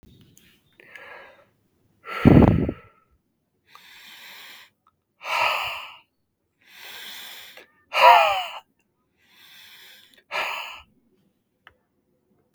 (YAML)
exhalation_length: 12.5 s
exhalation_amplitude: 32766
exhalation_signal_mean_std_ratio: 0.28
survey_phase: beta (2021-08-13 to 2022-03-07)
age: 18-44
gender: Male
wearing_mask: 'No'
symptom_cough_any: true
symptom_sore_throat: true
symptom_headache: true
smoker_status: Never smoked
respiratory_condition_asthma: false
respiratory_condition_other: false
recruitment_source: REACT
submission_delay: 1 day
covid_test_result: Negative
covid_test_method: RT-qPCR
influenza_a_test_result: Negative
influenza_b_test_result: Negative